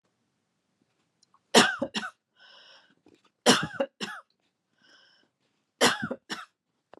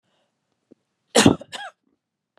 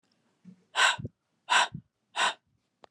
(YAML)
three_cough_length: 7.0 s
three_cough_amplitude: 22588
three_cough_signal_mean_std_ratio: 0.27
cough_length: 2.4 s
cough_amplitude: 31032
cough_signal_mean_std_ratio: 0.22
exhalation_length: 2.9 s
exhalation_amplitude: 10100
exhalation_signal_mean_std_ratio: 0.36
survey_phase: beta (2021-08-13 to 2022-03-07)
age: 45-64
gender: Female
wearing_mask: 'No'
symptom_none: true
smoker_status: Never smoked
respiratory_condition_asthma: false
respiratory_condition_other: false
recruitment_source: REACT
submission_delay: 1 day
covid_test_result: Negative
covid_test_method: RT-qPCR
influenza_a_test_result: Negative
influenza_b_test_result: Negative